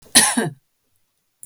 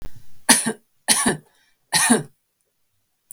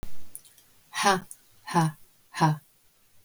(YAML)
cough_length: 1.5 s
cough_amplitude: 32768
cough_signal_mean_std_ratio: 0.35
three_cough_length: 3.3 s
three_cough_amplitude: 32768
three_cough_signal_mean_std_ratio: 0.43
exhalation_length: 3.2 s
exhalation_amplitude: 11297
exhalation_signal_mean_std_ratio: 0.48
survey_phase: beta (2021-08-13 to 2022-03-07)
age: 45-64
gender: Female
wearing_mask: 'No'
symptom_runny_or_blocked_nose: true
smoker_status: Never smoked
respiratory_condition_asthma: false
respiratory_condition_other: false
recruitment_source: Test and Trace
submission_delay: 3 days
covid_test_method: RT-qPCR
covid_ct_value: 40.6
covid_ct_gene: N gene